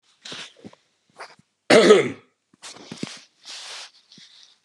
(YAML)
cough_length: 4.6 s
cough_amplitude: 31907
cough_signal_mean_std_ratio: 0.28
survey_phase: beta (2021-08-13 to 2022-03-07)
age: 65+
gender: Male
wearing_mask: 'No'
symptom_cough_any: true
smoker_status: Never smoked
respiratory_condition_asthma: false
respiratory_condition_other: false
recruitment_source: REACT
submission_delay: 2 days
covid_test_result: Negative
covid_test_method: RT-qPCR
influenza_a_test_result: Negative
influenza_b_test_result: Negative